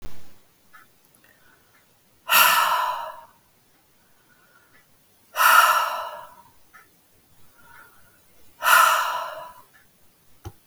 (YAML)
exhalation_length: 10.7 s
exhalation_amplitude: 23881
exhalation_signal_mean_std_ratio: 0.38
survey_phase: beta (2021-08-13 to 2022-03-07)
age: 45-64
gender: Female
wearing_mask: 'No'
symptom_cough_any: true
symptom_fatigue: true
symptom_change_to_sense_of_smell_or_taste: true
symptom_loss_of_taste: true
symptom_other: true
symptom_onset: 3 days
smoker_status: Never smoked
respiratory_condition_asthma: false
respiratory_condition_other: false
recruitment_source: Test and Trace
submission_delay: 1 day
covid_test_result: Positive
covid_test_method: RT-qPCR
covid_ct_value: 22.3
covid_ct_gene: ORF1ab gene
covid_ct_mean: 23.0
covid_viral_load: 29000 copies/ml
covid_viral_load_category: Low viral load (10K-1M copies/ml)